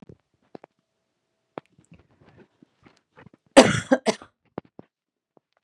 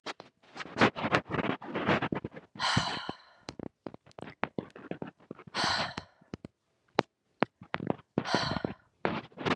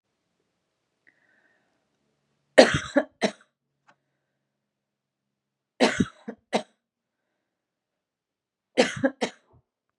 cough_length: 5.6 s
cough_amplitude: 32768
cough_signal_mean_std_ratio: 0.17
exhalation_length: 9.6 s
exhalation_amplitude: 22404
exhalation_signal_mean_std_ratio: 0.43
three_cough_length: 10.0 s
three_cough_amplitude: 32113
three_cough_signal_mean_std_ratio: 0.2
survey_phase: beta (2021-08-13 to 2022-03-07)
age: 45-64
gender: Female
wearing_mask: 'No'
symptom_cough_any: true
symptom_sore_throat: true
symptom_other: true
symptom_onset: 3 days
smoker_status: Never smoked
respiratory_condition_asthma: false
respiratory_condition_other: false
recruitment_source: Test and Trace
submission_delay: 1 day
covid_test_result: Positive
covid_test_method: RT-qPCR
covid_ct_value: 21.7
covid_ct_gene: N gene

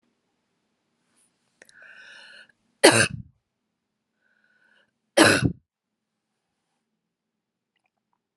cough_length: 8.4 s
cough_amplitude: 32711
cough_signal_mean_std_ratio: 0.2
survey_phase: alpha (2021-03-01 to 2021-08-12)
age: 45-64
gender: Female
wearing_mask: 'No'
symptom_none: true
smoker_status: Never smoked
respiratory_condition_asthma: false
respiratory_condition_other: false
recruitment_source: REACT
submission_delay: 1 day
covid_test_result: Negative
covid_test_method: RT-qPCR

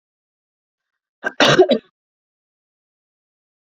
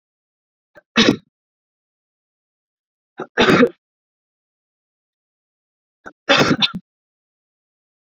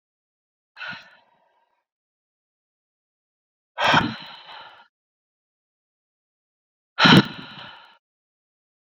cough_length: 3.8 s
cough_amplitude: 32149
cough_signal_mean_std_ratio: 0.24
three_cough_length: 8.2 s
three_cough_amplitude: 32761
three_cough_signal_mean_std_ratio: 0.26
exhalation_length: 9.0 s
exhalation_amplitude: 28594
exhalation_signal_mean_std_ratio: 0.21
survey_phase: beta (2021-08-13 to 2022-03-07)
age: 18-44
gender: Female
wearing_mask: 'No'
symptom_cough_any: true
symptom_headache: true
symptom_onset: 12 days
smoker_status: Never smoked
respiratory_condition_asthma: false
respiratory_condition_other: false
recruitment_source: REACT
submission_delay: 2 days
covid_test_result: Negative
covid_test_method: RT-qPCR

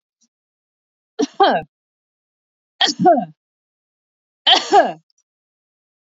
three_cough_length: 6.1 s
three_cough_amplitude: 28875
three_cough_signal_mean_std_ratio: 0.32
survey_phase: beta (2021-08-13 to 2022-03-07)
age: 45-64
gender: Female
wearing_mask: 'No'
symptom_fatigue: true
symptom_onset: 12 days
smoker_status: Ex-smoker
respiratory_condition_asthma: false
respiratory_condition_other: false
recruitment_source: REACT
submission_delay: 1 day
covid_test_result: Negative
covid_test_method: RT-qPCR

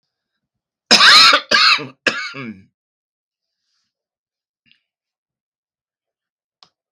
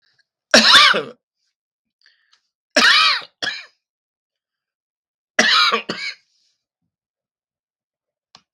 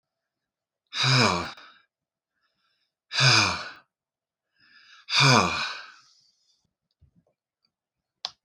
cough_length: 6.9 s
cough_amplitude: 32768
cough_signal_mean_std_ratio: 0.3
three_cough_length: 8.5 s
three_cough_amplitude: 32768
three_cough_signal_mean_std_ratio: 0.33
exhalation_length: 8.4 s
exhalation_amplitude: 20423
exhalation_signal_mean_std_ratio: 0.34
survey_phase: beta (2021-08-13 to 2022-03-07)
age: 65+
gender: Male
wearing_mask: 'No'
symptom_runny_or_blocked_nose: true
symptom_fatigue: true
symptom_onset: 12 days
smoker_status: Ex-smoker
respiratory_condition_asthma: false
respiratory_condition_other: false
recruitment_source: REACT
submission_delay: 2 days
covid_test_result: Negative
covid_test_method: RT-qPCR
influenza_a_test_result: Negative
influenza_b_test_result: Negative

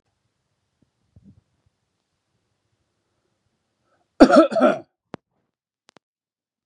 cough_length: 6.7 s
cough_amplitude: 32768
cough_signal_mean_std_ratio: 0.2
survey_phase: beta (2021-08-13 to 2022-03-07)
age: 65+
gender: Male
wearing_mask: 'No'
symptom_none: true
smoker_status: Never smoked
respiratory_condition_asthma: false
respiratory_condition_other: false
recruitment_source: REACT
submission_delay: 2 days
covid_test_result: Negative
covid_test_method: RT-qPCR
influenza_a_test_result: Negative
influenza_b_test_result: Negative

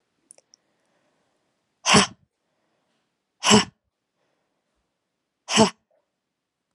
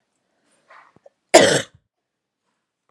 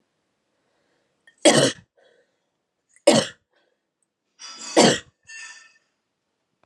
exhalation_length: 6.7 s
exhalation_amplitude: 27855
exhalation_signal_mean_std_ratio: 0.22
cough_length: 2.9 s
cough_amplitude: 32768
cough_signal_mean_std_ratio: 0.22
three_cough_length: 6.7 s
three_cough_amplitude: 28470
three_cough_signal_mean_std_ratio: 0.26
survey_phase: beta (2021-08-13 to 2022-03-07)
age: 18-44
gender: Female
wearing_mask: 'No'
symptom_cough_any: true
symptom_runny_or_blocked_nose: true
smoker_status: Never smoked
respiratory_condition_asthma: false
respiratory_condition_other: false
recruitment_source: Test and Trace
submission_delay: 0 days
covid_test_result: Negative
covid_test_method: LFT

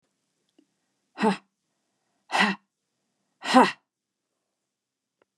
exhalation_length: 5.4 s
exhalation_amplitude: 23911
exhalation_signal_mean_std_ratio: 0.24
survey_phase: beta (2021-08-13 to 2022-03-07)
age: 45-64
gender: Female
wearing_mask: 'No'
symptom_none: true
smoker_status: Ex-smoker
respiratory_condition_asthma: false
respiratory_condition_other: false
recruitment_source: REACT
submission_delay: 1 day
covid_test_result: Negative
covid_test_method: RT-qPCR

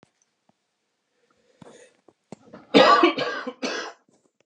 cough_length: 4.5 s
cough_amplitude: 28830
cough_signal_mean_std_ratio: 0.31
survey_phase: beta (2021-08-13 to 2022-03-07)
age: 45-64
gender: Male
wearing_mask: 'No'
symptom_none: true
smoker_status: Ex-smoker
respiratory_condition_asthma: false
respiratory_condition_other: false
recruitment_source: REACT
submission_delay: 4 days
covid_test_result: Negative
covid_test_method: RT-qPCR
influenza_a_test_result: Negative
influenza_b_test_result: Negative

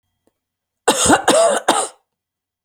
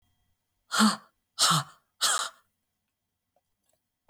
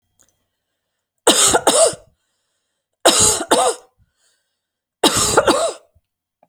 cough_length: 2.6 s
cough_amplitude: 32767
cough_signal_mean_std_ratio: 0.47
exhalation_length: 4.1 s
exhalation_amplitude: 13289
exhalation_signal_mean_std_ratio: 0.33
three_cough_length: 6.5 s
three_cough_amplitude: 32768
three_cough_signal_mean_std_ratio: 0.43
survey_phase: beta (2021-08-13 to 2022-03-07)
age: 65+
gender: Female
wearing_mask: 'No'
symptom_sore_throat: true
smoker_status: Never smoked
respiratory_condition_asthma: false
respiratory_condition_other: false
recruitment_source: REACT
submission_delay: 1 day
covid_test_result: Negative
covid_test_method: RT-qPCR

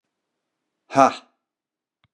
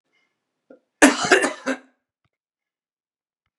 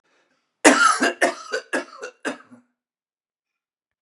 exhalation_length: 2.1 s
exhalation_amplitude: 29783
exhalation_signal_mean_std_ratio: 0.19
cough_length: 3.6 s
cough_amplitude: 32767
cough_signal_mean_std_ratio: 0.27
three_cough_length: 4.0 s
three_cough_amplitude: 32767
three_cough_signal_mean_std_ratio: 0.34
survey_phase: beta (2021-08-13 to 2022-03-07)
age: 45-64
gender: Male
wearing_mask: 'No'
symptom_cough_any: true
symptom_runny_or_blocked_nose: true
symptom_fatigue: true
symptom_onset: 6 days
smoker_status: Never smoked
respiratory_condition_asthma: false
respiratory_condition_other: false
recruitment_source: Test and Trace
submission_delay: 2 days
covid_test_result: Positive
covid_test_method: RT-qPCR
covid_ct_value: 20.4
covid_ct_gene: N gene
covid_ct_mean: 20.7
covid_viral_load: 160000 copies/ml
covid_viral_load_category: Low viral load (10K-1M copies/ml)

